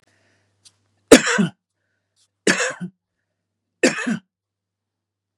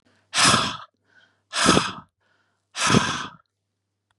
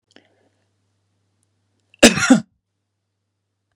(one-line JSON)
{"three_cough_length": "5.4 s", "three_cough_amplitude": 32768, "three_cough_signal_mean_std_ratio": 0.26, "exhalation_length": "4.2 s", "exhalation_amplitude": 29181, "exhalation_signal_mean_std_ratio": 0.42, "cough_length": "3.8 s", "cough_amplitude": 32768, "cough_signal_mean_std_ratio": 0.2, "survey_phase": "beta (2021-08-13 to 2022-03-07)", "age": "65+", "gender": "Male", "wearing_mask": "No", "symptom_none": true, "smoker_status": "Never smoked", "respiratory_condition_asthma": false, "respiratory_condition_other": false, "recruitment_source": "REACT", "submission_delay": "-14 days", "covid_test_result": "Negative", "covid_test_method": "RT-qPCR", "influenza_a_test_result": "Unknown/Void", "influenza_b_test_result": "Unknown/Void"}